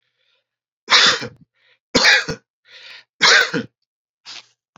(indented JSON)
{
  "three_cough_length": "4.8 s",
  "three_cough_amplitude": 32768,
  "three_cough_signal_mean_std_ratio": 0.37,
  "survey_phase": "beta (2021-08-13 to 2022-03-07)",
  "age": "45-64",
  "gender": "Male",
  "wearing_mask": "No",
  "symptom_none": true,
  "symptom_onset": "9 days",
  "smoker_status": "Never smoked",
  "respiratory_condition_asthma": false,
  "respiratory_condition_other": false,
  "recruitment_source": "Test and Trace",
  "submission_delay": "2 days",
  "covid_test_result": "Positive",
  "covid_test_method": "ePCR"
}